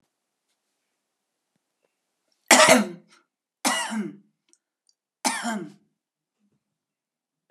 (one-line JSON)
{"three_cough_length": "7.5 s", "three_cough_amplitude": 31120, "three_cough_signal_mean_std_ratio": 0.25, "survey_phase": "alpha (2021-03-01 to 2021-08-12)", "age": "65+", "gender": "Female", "wearing_mask": "No", "symptom_none": true, "smoker_status": "Prefer not to say", "respiratory_condition_asthma": false, "respiratory_condition_other": false, "recruitment_source": "REACT", "submission_delay": "1 day", "covid_test_result": "Negative", "covid_test_method": "RT-qPCR"}